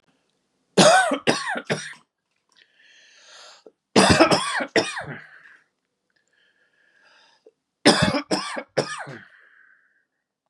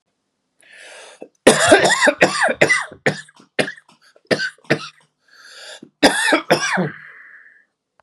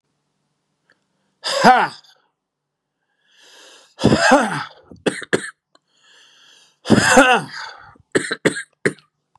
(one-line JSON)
{"three_cough_length": "10.5 s", "three_cough_amplitude": 32343, "three_cough_signal_mean_std_ratio": 0.36, "cough_length": "8.0 s", "cough_amplitude": 32768, "cough_signal_mean_std_ratio": 0.43, "exhalation_length": "9.4 s", "exhalation_amplitude": 32768, "exhalation_signal_mean_std_ratio": 0.36, "survey_phase": "beta (2021-08-13 to 2022-03-07)", "age": "45-64", "gender": "Male", "wearing_mask": "No", "symptom_cough_any": true, "symptom_new_continuous_cough": true, "symptom_sore_throat": true, "symptom_fatigue": true, "symptom_headache": true, "symptom_change_to_sense_of_smell_or_taste": true, "symptom_loss_of_taste": true, "symptom_onset": "2 days", "smoker_status": "Never smoked", "respiratory_condition_asthma": true, "respiratory_condition_other": false, "recruitment_source": "Test and Trace", "submission_delay": "1 day", "covid_test_result": "Positive", "covid_test_method": "LAMP"}